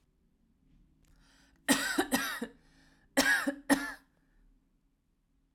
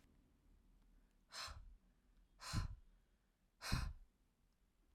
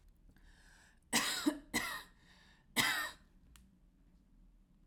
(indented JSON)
{
  "cough_length": "5.5 s",
  "cough_amplitude": 9024,
  "cough_signal_mean_std_ratio": 0.36,
  "exhalation_length": "4.9 s",
  "exhalation_amplitude": 2129,
  "exhalation_signal_mean_std_ratio": 0.37,
  "three_cough_length": "4.9 s",
  "three_cough_amplitude": 4426,
  "three_cough_signal_mean_std_ratio": 0.4,
  "survey_phase": "alpha (2021-03-01 to 2021-08-12)",
  "age": "18-44",
  "gender": "Female",
  "wearing_mask": "No",
  "symptom_none": true,
  "smoker_status": "Current smoker (1 to 10 cigarettes per day)",
  "respiratory_condition_asthma": false,
  "respiratory_condition_other": false,
  "recruitment_source": "REACT",
  "submission_delay": "1 day",
  "covid_test_result": "Negative",
  "covid_test_method": "RT-qPCR"
}